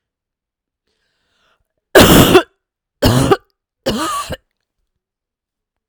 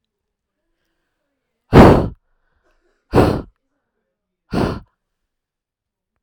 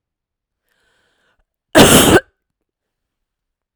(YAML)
three_cough_length: 5.9 s
three_cough_amplitude: 32768
three_cough_signal_mean_std_ratio: 0.33
exhalation_length: 6.2 s
exhalation_amplitude: 32768
exhalation_signal_mean_std_ratio: 0.26
cough_length: 3.8 s
cough_amplitude: 32768
cough_signal_mean_std_ratio: 0.28
survey_phase: beta (2021-08-13 to 2022-03-07)
age: 45-64
gender: Female
wearing_mask: 'Yes'
symptom_none: true
smoker_status: Never smoked
respiratory_condition_asthma: false
respiratory_condition_other: false
recruitment_source: REACT
submission_delay: 2 days
covid_test_result: Negative
covid_test_method: RT-qPCR
influenza_a_test_result: Negative
influenza_b_test_result: Negative